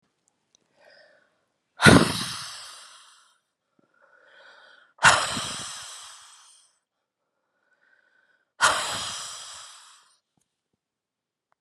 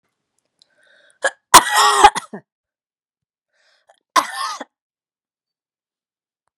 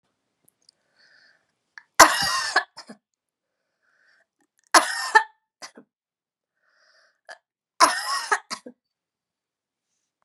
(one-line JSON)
{"exhalation_length": "11.6 s", "exhalation_amplitude": 32676, "exhalation_signal_mean_std_ratio": 0.25, "cough_length": "6.6 s", "cough_amplitude": 32768, "cough_signal_mean_std_ratio": 0.24, "three_cough_length": "10.2 s", "three_cough_amplitude": 32768, "three_cough_signal_mean_std_ratio": 0.23, "survey_phase": "beta (2021-08-13 to 2022-03-07)", "age": "45-64", "gender": "Female", "wearing_mask": "No", "symptom_cough_any": true, "symptom_loss_of_taste": true, "symptom_onset": "8 days", "smoker_status": "Never smoked", "respiratory_condition_asthma": false, "respiratory_condition_other": false, "recruitment_source": "Test and Trace", "submission_delay": "1 day", "covid_test_result": "Positive", "covid_test_method": "RT-qPCR", "covid_ct_value": 18.6, "covid_ct_gene": "N gene", "covid_ct_mean": 18.9, "covid_viral_load": "610000 copies/ml", "covid_viral_load_category": "Low viral load (10K-1M copies/ml)"}